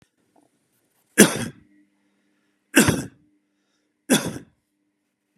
{"three_cough_length": "5.4 s", "three_cough_amplitude": 32768, "three_cough_signal_mean_std_ratio": 0.24, "survey_phase": "beta (2021-08-13 to 2022-03-07)", "age": "65+", "gender": "Male", "wearing_mask": "No", "symptom_none": true, "smoker_status": "Ex-smoker", "respiratory_condition_asthma": false, "respiratory_condition_other": false, "recruitment_source": "REACT", "submission_delay": "2 days", "covid_test_result": "Negative", "covid_test_method": "RT-qPCR", "influenza_a_test_result": "Negative", "influenza_b_test_result": "Negative"}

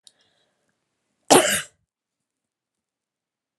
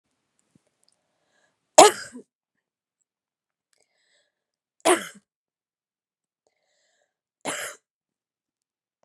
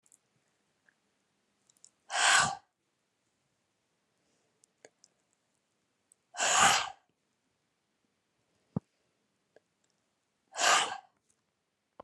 {"cough_length": "3.6 s", "cough_amplitude": 31097, "cough_signal_mean_std_ratio": 0.2, "three_cough_length": "9.0 s", "three_cough_amplitude": 32768, "three_cough_signal_mean_std_ratio": 0.14, "exhalation_length": "12.0 s", "exhalation_amplitude": 11257, "exhalation_signal_mean_std_ratio": 0.25, "survey_phase": "alpha (2021-03-01 to 2021-08-12)", "age": "45-64", "gender": "Female", "wearing_mask": "No", "symptom_none": true, "smoker_status": "Ex-smoker", "respiratory_condition_asthma": false, "respiratory_condition_other": false, "recruitment_source": "REACT", "submission_delay": "2 days", "covid_test_result": "Negative", "covid_test_method": "RT-qPCR"}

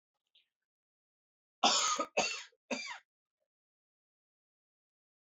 {"cough_length": "5.2 s", "cough_amplitude": 7293, "cough_signal_mean_std_ratio": 0.29, "survey_phase": "alpha (2021-03-01 to 2021-08-12)", "age": "45-64", "gender": "Male", "wearing_mask": "No", "symptom_cough_any": true, "symptom_shortness_of_breath": true, "symptom_fatigue": true, "symptom_change_to_sense_of_smell_or_taste": true, "symptom_onset": "5 days", "smoker_status": "Ex-smoker", "respiratory_condition_asthma": false, "respiratory_condition_other": false, "recruitment_source": "Test and Trace", "submission_delay": "4 days", "covid_test_result": "Positive", "covid_test_method": "RT-qPCR", "covid_ct_value": 18.5, "covid_ct_gene": "N gene", "covid_ct_mean": 18.6, "covid_viral_load": "790000 copies/ml", "covid_viral_load_category": "Low viral load (10K-1M copies/ml)"}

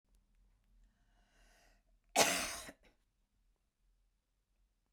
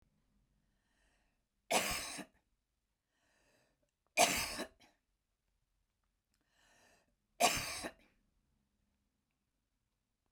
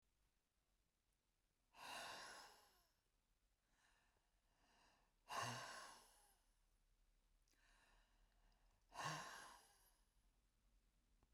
{"cough_length": "4.9 s", "cough_amplitude": 8827, "cough_signal_mean_std_ratio": 0.23, "three_cough_length": "10.3 s", "three_cough_amplitude": 6647, "three_cough_signal_mean_std_ratio": 0.25, "exhalation_length": "11.3 s", "exhalation_amplitude": 472, "exhalation_signal_mean_std_ratio": 0.39, "survey_phase": "beta (2021-08-13 to 2022-03-07)", "age": "45-64", "gender": "Female", "wearing_mask": "No", "symptom_none": true, "smoker_status": "Ex-smoker", "respiratory_condition_asthma": false, "respiratory_condition_other": false, "recruitment_source": "REACT", "submission_delay": "1 day", "covid_test_result": "Negative", "covid_test_method": "RT-qPCR", "influenza_a_test_result": "Negative", "influenza_b_test_result": "Negative"}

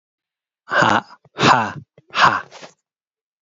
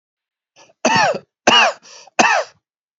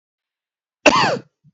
{"exhalation_length": "3.4 s", "exhalation_amplitude": 28473, "exhalation_signal_mean_std_ratio": 0.39, "three_cough_length": "3.0 s", "three_cough_amplitude": 32091, "three_cough_signal_mean_std_ratio": 0.44, "cough_length": "1.5 s", "cough_amplitude": 30110, "cough_signal_mean_std_ratio": 0.34, "survey_phase": "beta (2021-08-13 to 2022-03-07)", "age": "18-44", "gender": "Male", "wearing_mask": "No", "symptom_fatigue": true, "symptom_headache": true, "symptom_onset": "2 days", "smoker_status": "Never smoked", "respiratory_condition_asthma": false, "respiratory_condition_other": false, "recruitment_source": "Test and Trace", "submission_delay": "2 days", "covid_test_result": "Positive", "covid_test_method": "RT-qPCR", "covid_ct_value": 18.4, "covid_ct_gene": "ORF1ab gene", "covid_ct_mean": 18.7, "covid_viral_load": "720000 copies/ml", "covid_viral_load_category": "Low viral load (10K-1M copies/ml)"}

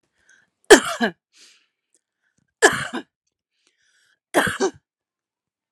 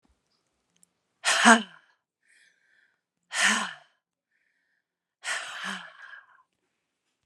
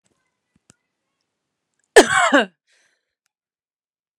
{"three_cough_length": "5.7 s", "three_cough_amplitude": 32768, "three_cough_signal_mean_std_ratio": 0.24, "exhalation_length": "7.3 s", "exhalation_amplitude": 31371, "exhalation_signal_mean_std_ratio": 0.26, "cough_length": "4.2 s", "cough_amplitude": 32768, "cough_signal_mean_std_ratio": 0.22, "survey_phase": "alpha (2021-03-01 to 2021-08-12)", "age": "45-64", "gender": "Female", "wearing_mask": "No", "symptom_none": true, "smoker_status": "Ex-smoker", "respiratory_condition_asthma": false, "respiratory_condition_other": false, "recruitment_source": "REACT", "submission_delay": "2 days", "covid_test_result": "Negative", "covid_test_method": "RT-qPCR"}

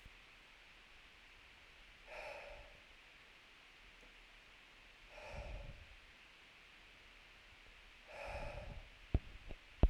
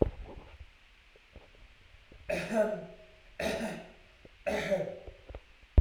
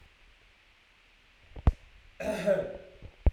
{"exhalation_length": "9.9 s", "exhalation_amplitude": 6388, "exhalation_signal_mean_std_ratio": 0.33, "three_cough_length": "5.8 s", "three_cough_amplitude": 12981, "three_cough_signal_mean_std_ratio": 0.39, "cough_length": "3.3 s", "cough_amplitude": 9649, "cough_signal_mean_std_ratio": 0.32, "survey_phase": "beta (2021-08-13 to 2022-03-07)", "age": "18-44", "gender": "Male", "wearing_mask": "No", "symptom_none": true, "smoker_status": "Never smoked", "respiratory_condition_asthma": false, "respiratory_condition_other": false, "recruitment_source": "REACT", "submission_delay": "1 day", "covid_test_result": "Negative", "covid_test_method": "RT-qPCR"}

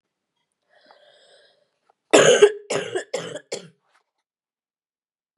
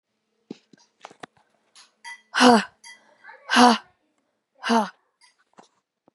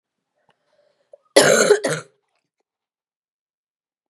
{"three_cough_length": "5.4 s", "three_cough_amplitude": 31186, "three_cough_signal_mean_std_ratio": 0.27, "exhalation_length": "6.1 s", "exhalation_amplitude": 28512, "exhalation_signal_mean_std_ratio": 0.27, "cough_length": "4.1 s", "cough_amplitude": 32768, "cough_signal_mean_std_ratio": 0.28, "survey_phase": "beta (2021-08-13 to 2022-03-07)", "age": "18-44", "gender": "Female", "wearing_mask": "No", "symptom_cough_any": true, "symptom_runny_or_blocked_nose": true, "symptom_sore_throat": true, "symptom_fatigue": true, "symptom_fever_high_temperature": true, "symptom_onset": "3 days", "smoker_status": "Never smoked", "respiratory_condition_asthma": false, "respiratory_condition_other": false, "recruitment_source": "Test and Trace", "submission_delay": "2 days", "covid_test_result": "Positive", "covid_test_method": "RT-qPCR", "covid_ct_value": 26.7, "covid_ct_gene": "N gene", "covid_ct_mean": 28.1, "covid_viral_load": "610 copies/ml", "covid_viral_load_category": "Minimal viral load (< 10K copies/ml)"}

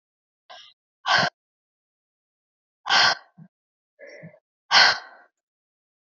{"exhalation_length": "6.1 s", "exhalation_amplitude": 24510, "exhalation_signal_mean_std_ratio": 0.28, "survey_phase": "beta (2021-08-13 to 2022-03-07)", "age": "18-44", "gender": "Female", "wearing_mask": "No", "symptom_cough_any": true, "symptom_runny_or_blocked_nose": true, "symptom_sore_throat": true, "symptom_abdominal_pain": true, "symptom_fatigue": true, "symptom_fever_high_temperature": true, "symptom_headache": true, "symptom_onset": "2 days", "smoker_status": "Never smoked", "respiratory_condition_asthma": false, "respiratory_condition_other": false, "recruitment_source": "Test and Trace", "submission_delay": "1 day", "covid_test_result": "Positive", "covid_test_method": "RT-qPCR", "covid_ct_value": 24.1, "covid_ct_gene": "ORF1ab gene", "covid_ct_mean": 24.1, "covid_viral_load": "13000 copies/ml", "covid_viral_load_category": "Low viral load (10K-1M copies/ml)"}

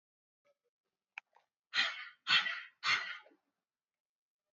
{"exhalation_length": "4.5 s", "exhalation_amplitude": 5504, "exhalation_signal_mean_std_ratio": 0.32, "survey_phase": "alpha (2021-03-01 to 2021-08-12)", "age": "18-44", "gender": "Female", "wearing_mask": "No", "symptom_none": true, "smoker_status": "Never smoked", "respiratory_condition_asthma": false, "respiratory_condition_other": false, "recruitment_source": "REACT", "submission_delay": "1 day", "covid_test_result": "Negative", "covid_test_method": "RT-qPCR"}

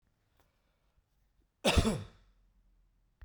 {"cough_length": "3.2 s", "cough_amplitude": 6503, "cough_signal_mean_std_ratio": 0.26, "survey_phase": "beta (2021-08-13 to 2022-03-07)", "age": "45-64", "gender": "Male", "wearing_mask": "No", "symptom_none": true, "smoker_status": "Never smoked", "respiratory_condition_asthma": false, "respiratory_condition_other": false, "recruitment_source": "REACT", "submission_delay": "2 days", "covid_test_result": "Negative", "covid_test_method": "RT-qPCR"}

